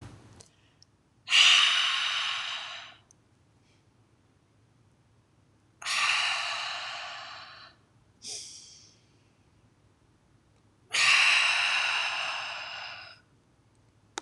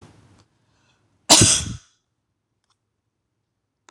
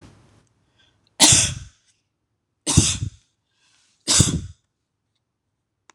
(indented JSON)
{
  "exhalation_length": "14.2 s",
  "exhalation_amplitude": 13972,
  "exhalation_signal_mean_std_ratio": 0.44,
  "cough_length": "3.9 s",
  "cough_amplitude": 26028,
  "cough_signal_mean_std_ratio": 0.23,
  "three_cough_length": "5.9 s",
  "three_cough_amplitude": 26028,
  "three_cough_signal_mean_std_ratio": 0.31,
  "survey_phase": "beta (2021-08-13 to 2022-03-07)",
  "age": "18-44",
  "gender": "Female",
  "wearing_mask": "No",
  "symptom_none": true,
  "smoker_status": "Never smoked",
  "respiratory_condition_asthma": false,
  "respiratory_condition_other": false,
  "recruitment_source": "REACT",
  "submission_delay": "2 days",
  "covid_test_result": "Negative",
  "covid_test_method": "RT-qPCR",
  "influenza_a_test_result": "Negative",
  "influenza_b_test_result": "Negative"
}